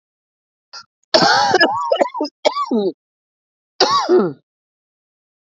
cough_length: 5.5 s
cough_amplitude: 30336
cough_signal_mean_std_ratio: 0.49
survey_phase: beta (2021-08-13 to 2022-03-07)
age: 18-44
gender: Female
wearing_mask: 'No'
symptom_cough_any: true
symptom_runny_or_blocked_nose: true
symptom_shortness_of_breath: true
symptom_sore_throat: true
symptom_fatigue: true
symptom_onset: 6 days
smoker_status: Ex-smoker
respiratory_condition_asthma: false
respiratory_condition_other: true
recruitment_source: REACT
submission_delay: 1 day
covid_test_result: Negative
covid_test_method: RT-qPCR
influenza_a_test_result: Negative
influenza_b_test_result: Negative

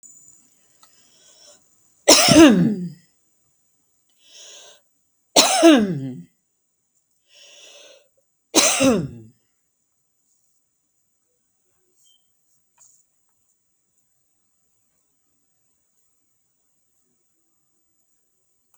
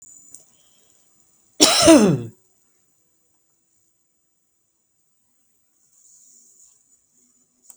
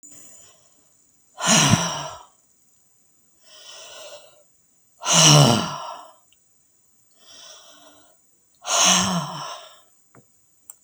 three_cough_length: 18.8 s
three_cough_amplitude: 32768
three_cough_signal_mean_std_ratio: 0.25
cough_length: 7.8 s
cough_amplitude: 32768
cough_signal_mean_std_ratio: 0.22
exhalation_length: 10.8 s
exhalation_amplitude: 32768
exhalation_signal_mean_std_ratio: 0.35
survey_phase: beta (2021-08-13 to 2022-03-07)
age: 65+
gender: Female
wearing_mask: 'No'
symptom_none: true
symptom_onset: 10 days
smoker_status: Ex-smoker
respiratory_condition_asthma: false
respiratory_condition_other: false
recruitment_source: REACT
submission_delay: 3 days
covid_test_result: Negative
covid_test_method: RT-qPCR
influenza_a_test_result: Negative
influenza_b_test_result: Negative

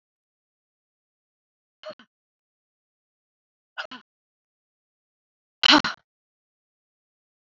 exhalation_length: 7.4 s
exhalation_amplitude: 26000
exhalation_signal_mean_std_ratio: 0.13
survey_phase: alpha (2021-03-01 to 2021-08-12)
age: 45-64
gender: Female
wearing_mask: 'No'
symptom_shortness_of_breath: true
smoker_status: Never smoked
respiratory_condition_asthma: false
respiratory_condition_other: false
recruitment_source: Test and Trace
submission_delay: 1 day
covid_test_result: Positive
covid_test_method: RT-qPCR
covid_ct_value: 24.6
covid_ct_gene: ORF1ab gene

